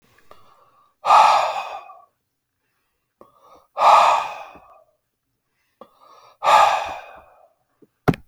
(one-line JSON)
{"exhalation_length": "8.3 s", "exhalation_amplitude": 28236, "exhalation_signal_mean_std_ratio": 0.36, "survey_phase": "alpha (2021-03-01 to 2021-08-12)", "age": "18-44", "gender": "Male", "wearing_mask": "No", "symptom_none": true, "smoker_status": "Ex-smoker", "respiratory_condition_asthma": false, "respiratory_condition_other": false, "recruitment_source": "REACT", "submission_delay": "2 days", "covid_test_result": "Negative", "covid_test_method": "RT-qPCR"}